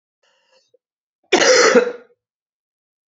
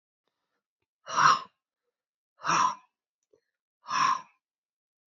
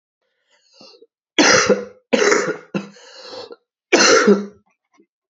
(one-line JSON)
{"cough_length": "3.1 s", "cough_amplitude": 28633, "cough_signal_mean_std_ratio": 0.35, "exhalation_length": "5.1 s", "exhalation_amplitude": 13918, "exhalation_signal_mean_std_ratio": 0.32, "three_cough_length": "5.3 s", "three_cough_amplitude": 32767, "three_cough_signal_mean_std_ratio": 0.43, "survey_phase": "beta (2021-08-13 to 2022-03-07)", "age": "18-44", "gender": "Female", "wearing_mask": "No", "symptom_cough_any": true, "symptom_runny_or_blocked_nose": true, "symptom_sore_throat": true, "symptom_diarrhoea": true, "symptom_fatigue": true, "symptom_headache": true, "symptom_change_to_sense_of_smell_or_taste": true, "symptom_loss_of_taste": true, "symptom_onset": "5 days", "smoker_status": "Never smoked", "respiratory_condition_asthma": false, "respiratory_condition_other": false, "recruitment_source": "Test and Trace", "submission_delay": "1 day", "covid_test_result": "Negative", "covid_test_method": "RT-qPCR"}